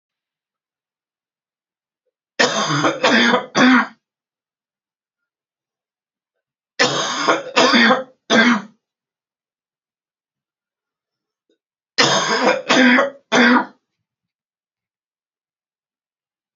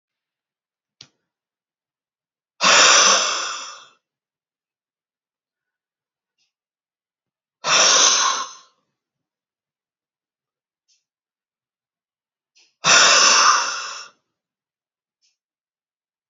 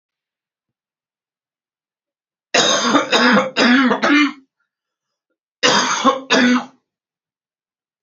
{"three_cough_length": "16.6 s", "three_cough_amplitude": 32767, "three_cough_signal_mean_std_ratio": 0.39, "exhalation_length": "16.3 s", "exhalation_amplitude": 31368, "exhalation_signal_mean_std_ratio": 0.32, "cough_length": "8.0 s", "cough_amplitude": 32768, "cough_signal_mean_std_ratio": 0.47, "survey_phase": "beta (2021-08-13 to 2022-03-07)", "age": "45-64", "gender": "Female", "wearing_mask": "No", "symptom_cough_any": true, "symptom_new_continuous_cough": true, "symptom_sore_throat": true, "symptom_fever_high_temperature": true, "symptom_headache": true, "symptom_change_to_sense_of_smell_or_taste": true, "symptom_loss_of_taste": true, "smoker_status": "Never smoked", "respiratory_condition_asthma": true, "respiratory_condition_other": false, "recruitment_source": "Test and Trace", "submission_delay": "2 days", "covid_test_result": "Positive", "covid_test_method": "RT-qPCR", "covid_ct_value": 14.3, "covid_ct_gene": "ORF1ab gene"}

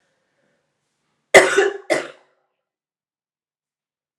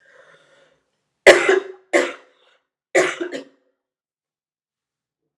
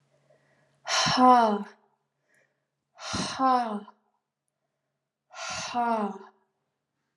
{"cough_length": "4.2 s", "cough_amplitude": 32768, "cough_signal_mean_std_ratio": 0.23, "three_cough_length": "5.4 s", "three_cough_amplitude": 32768, "three_cough_signal_mean_std_ratio": 0.26, "exhalation_length": "7.2 s", "exhalation_amplitude": 17510, "exhalation_signal_mean_std_ratio": 0.38, "survey_phase": "alpha (2021-03-01 to 2021-08-12)", "age": "18-44", "gender": "Female", "wearing_mask": "No", "symptom_cough_any": true, "symptom_fatigue": true, "symptom_change_to_sense_of_smell_or_taste": true, "symptom_onset": "4 days", "smoker_status": "Never smoked", "respiratory_condition_asthma": false, "respiratory_condition_other": false, "recruitment_source": "Test and Trace", "submission_delay": "2 days", "covid_test_result": "Positive", "covid_test_method": "RT-qPCR", "covid_ct_value": 28.6, "covid_ct_gene": "N gene"}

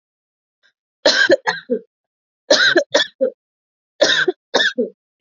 {"three_cough_length": "5.2 s", "three_cough_amplitude": 30998, "three_cough_signal_mean_std_ratio": 0.44, "survey_phase": "alpha (2021-03-01 to 2021-08-12)", "age": "18-44", "gender": "Female", "wearing_mask": "No", "symptom_none": true, "smoker_status": "Never smoked", "respiratory_condition_asthma": false, "respiratory_condition_other": false, "recruitment_source": "REACT", "submission_delay": "2 days", "covid_test_result": "Negative", "covid_test_method": "RT-qPCR"}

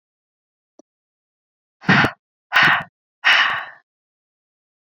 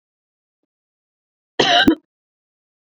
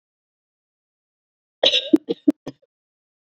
{"exhalation_length": "4.9 s", "exhalation_amplitude": 26711, "exhalation_signal_mean_std_ratio": 0.33, "cough_length": "2.8 s", "cough_amplitude": 27401, "cough_signal_mean_std_ratio": 0.28, "three_cough_length": "3.2 s", "three_cough_amplitude": 26655, "three_cough_signal_mean_std_ratio": 0.22, "survey_phase": "beta (2021-08-13 to 2022-03-07)", "age": "18-44", "gender": "Female", "wearing_mask": "No", "symptom_cough_any": true, "symptom_sore_throat": true, "symptom_abdominal_pain": true, "symptom_headache": true, "symptom_other": true, "symptom_onset": "1 day", "smoker_status": "Never smoked", "respiratory_condition_asthma": false, "respiratory_condition_other": false, "recruitment_source": "Test and Trace", "submission_delay": "0 days", "covid_test_result": "Positive", "covid_test_method": "RT-qPCR", "covid_ct_value": 32.2, "covid_ct_gene": "ORF1ab gene"}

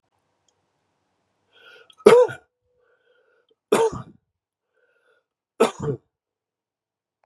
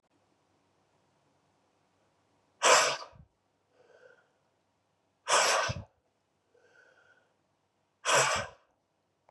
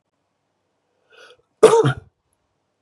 {"three_cough_length": "7.3 s", "three_cough_amplitude": 32768, "three_cough_signal_mean_std_ratio": 0.22, "exhalation_length": "9.3 s", "exhalation_amplitude": 11558, "exhalation_signal_mean_std_ratio": 0.29, "cough_length": "2.8 s", "cough_amplitude": 32768, "cough_signal_mean_std_ratio": 0.25, "survey_phase": "beta (2021-08-13 to 2022-03-07)", "age": "45-64", "gender": "Male", "wearing_mask": "No", "symptom_cough_any": true, "symptom_runny_or_blocked_nose": true, "symptom_change_to_sense_of_smell_or_taste": true, "symptom_loss_of_taste": true, "symptom_onset": "3 days", "smoker_status": "Ex-smoker", "respiratory_condition_asthma": false, "respiratory_condition_other": false, "recruitment_source": "Test and Trace", "submission_delay": "2 days", "covid_test_result": "Positive", "covid_test_method": "RT-qPCR", "covid_ct_value": 18.6, "covid_ct_gene": "ORF1ab gene", "covid_ct_mean": 19.5, "covid_viral_load": "390000 copies/ml", "covid_viral_load_category": "Low viral load (10K-1M copies/ml)"}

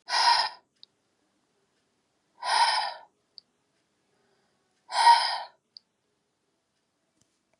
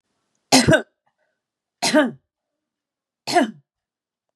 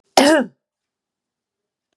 {"exhalation_length": "7.6 s", "exhalation_amplitude": 14311, "exhalation_signal_mean_std_ratio": 0.32, "three_cough_length": "4.4 s", "three_cough_amplitude": 31716, "three_cough_signal_mean_std_ratio": 0.32, "cough_length": "2.0 s", "cough_amplitude": 32768, "cough_signal_mean_std_ratio": 0.3, "survey_phase": "beta (2021-08-13 to 2022-03-07)", "age": "65+", "gender": "Female", "wearing_mask": "No", "symptom_none": true, "smoker_status": "Ex-smoker", "respiratory_condition_asthma": false, "respiratory_condition_other": false, "recruitment_source": "REACT", "submission_delay": "2 days", "covid_test_result": "Negative", "covid_test_method": "RT-qPCR", "influenza_a_test_result": "Unknown/Void", "influenza_b_test_result": "Unknown/Void"}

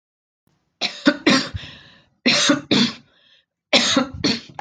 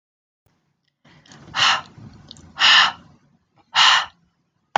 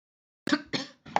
{"three_cough_length": "4.6 s", "three_cough_amplitude": 32768, "three_cough_signal_mean_std_ratio": 0.47, "exhalation_length": "4.8 s", "exhalation_amplitude": 28373, "exhalation_signal_mean_std_ratio": 0.36, "cough_length": "1.2 s", "cough_amplitude": 11770, "cough_signal_mean_std_ratio": 0.33, "survey_phase": "beta (2021-08-13 to 2022-03-07)", "age": "18-44", "gender": "Female", "wearing_mask": "No", "symptom_none": true, "smoker_status": "Never smoked", "respiratory_condition_asthma": false, "respiratory_condition_other": false, "recruitment_source": "REACT", "submission_delay": "1 day", "covid_test_result": "Negative", "covid_test_method": "RT-qPCR"}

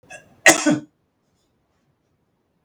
{"cough_length": "2.6 s", "cough_amplitude": 32768, "cough_signal_mean_std_ratio": 0.24, "survey_phase": "beta (2021-08-13 to 2022-03-07)", "age": "65+", "gender": "Male", "wearing_mask": "No", "symptom_none": true, "smoker_status": "Never smoked", "respiratory_condition_asthma": false, "respiratory_condition_other": false, "recruitment_source": "REACT", "submission_delay": "5 days", "covid_test_result": "Negative", "covid_test_method": "RT-qPCR", "influenza_a_test_result": "Negative", "influenza_b_test_result": "Negative"}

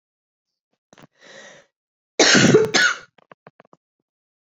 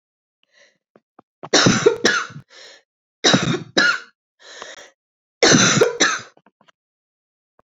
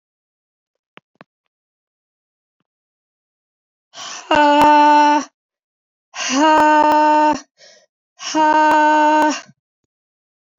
{"cough_length": "4.5 s", "cough_amplitude": 30739, "cough_signal_mean_std_ratio": 0.33, "three_cough_length": "7.8 s", "three_cough_amplitude": 32767, "three_cough_signal_mean_std_ratio": 0.4, "exhalation_length": "10.6 s", "exhalation_amplitude": 25967, "exhalation_signal_mean_std_ratio": 0.5, "survey_phase": "beta (2021-08-13 to 2022-03-07)", "age": "45-64", "gender": "Female", "wearing_mask": "No", "symptom_cough_any": true, "symptom_runny_or_blocked_nose": true, "symptom_shortness_of_breath": true, "symptom_change_to_sense_of_smell_or_taste": true, "symptom_other": true, "symptom_onset": "3 days", "smoker_status": "Never smoked", "respiratory_condition_asthma": true, "respiratory_condition_other": false, "recruitment_source": "Test and Trace", "submission_delay": "1 day", "covid_test_result": "Positive", "covid_test_method": "ePCR"}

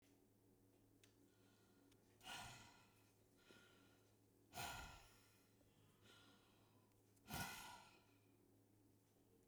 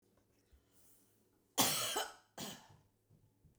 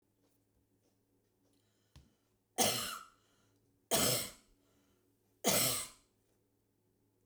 {"exhalation_length": "9.5 s", "exhalation_amplitude": 433, "exhalation_signal_mean_std_ratio": 0.49, "cough_length": "3.6 s", "cough_amplitude": 4302, "cough_signal_mean_std_ratio": 0.34, "three_cough_length": "7.3 s", "three_cough_amplitude": 4903, "three_cough_signal_mean_std_ratio": 0.32, "survey_phase": "beta (2021-08-13 to 2022-03-07)", "age": "45-64", "gender": "Female", "wearing_mask": "No", "symptom_none": true, "symptom_onset": "13 days", "smoker_status": "Ex-smoker", "respiratory_condition_asthma": false, "respiratory_condition_other": true, "recruitment_source": "REACT", "submission_delay": "3 days", "covid_test_result": "Negative", "covid_test_method": "RT-qPCR"}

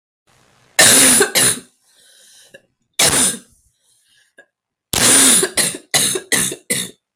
{"three_cough_length": "7.2 s", "three_cough_amplitude": 32768, "three_cough_signal_mean_std_ratio": 0.49, "survey_phase": "beta (2021-08-13 to 2022-03-07)", "age": "45-64", "gender": "Male", "wearing_mask": "No", "symptom_cough_any": true, "symptom_headache": true, "symptom_onset": "4 days", "smoker_status": "Ex-smoker", "respiratory_condition_asthma": false, "respiratory_condition_other": false, "recruitment_source": "Test and Trace", "submission_delay": "3 days", "covid_test_result": "Positive", "covid_test_method": "RT-qPCR"}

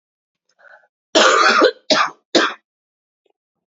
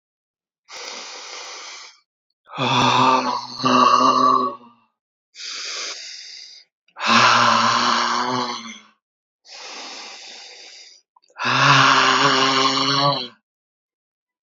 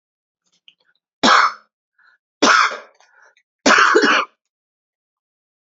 {"cough_length": "3.7 s", "cough_amplitude": 31121, "cough_signal_mean_std_ratio": 0.42, "exhalation_length": "14.4 s", "exhalation_amplitude": 26615, "exhalation_signal_mean_std_ratio": 0.57, "three_cough_length": "5.7 s", "three_cough_amplitude": 31553, "three_cough_signal_mean_std_ratio": 0.37, "survey_phase": "beta (2021-08-13 to 2022-03-07)", "age": "18-44", "gender": "Male", "wearing_mask": "No", "symptom_cough_any": true, "symptom_runny_or_blocked_nose": true, "symptom_sore_throat": true, "symptom_fatigue": true, "symptom_headache": true, "symptom_other": true, "symptom_onset": "2 days", "smoker_status": "Ex-smoker", "respiratory_condition_asthma": false, "respiratory_condition_other": false, "recruitment_source": "Test and Trace", "submission_delay": "1 day", "covid_test_result": "Positive", "covid_test_method": "RT-qPCR", "covid_ct_value": 15.0, "covid_ct_gene": "ORF1ab gene", "covid_ct_mean": 15.4, "covid_viral_load": "9100000 copies/ml", "covid_viral_load_category": "High viral load (>1M copies/ml)"}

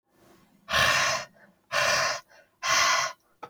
{"exhalation_length": "3.5 s", "exhalation_amplitude": 10595, "exhalation_signal_mean_std_ratio": 0.58, "survey_phase": "alpha (2021-03-01 to 2021-08-12)", "age": "18-44", "gender": "Male", "wearing_mask": "No", "symptom_cough_any": true, "symptom_onset": "4 days", "smoker_status": "Never smoked", "respiratory_condition_asthma": false, "respiratory_condition_other": false, "recruitment_source": "Test and Trace", "submission_delay": "2 days", "covid_test_result": "Positive", "covid_test_method": "RT-qPCR", "covid_ct_value": 16.7, "covid_ct_gene": "ORF1ab gene", "covid_ct_mean": 16.9, "covid_viral_load": "2800000 copies/ml", "covid_viral_load_category": "High viral load (>1M copies/ml)"}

